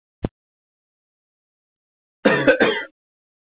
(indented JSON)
{
  "cough_length": "3.6 s",
  "cough_amplitude": 26913,
  "cough_signal_mean_std_ratio": 0.29,
  "survey_phase": "beta (2021-08-13 to 2022-03-07)",
  "age": "18-44",
  "gender": "Male",
  "wearing_mask": "No",
  "symptom_cough_any": true,
  "symptom_runny_or_blocked_nose": true,
  "smoker_status": "Never smoked",
  "respiratory_condition_asthma": false,
  "respiratory_condition_other": false,
  "recruitment_source": "Test and Trace",
  "submission_delay": "1 day",
  "covid_test_result": "Positive",
  "covid_test_method": "LFT"
}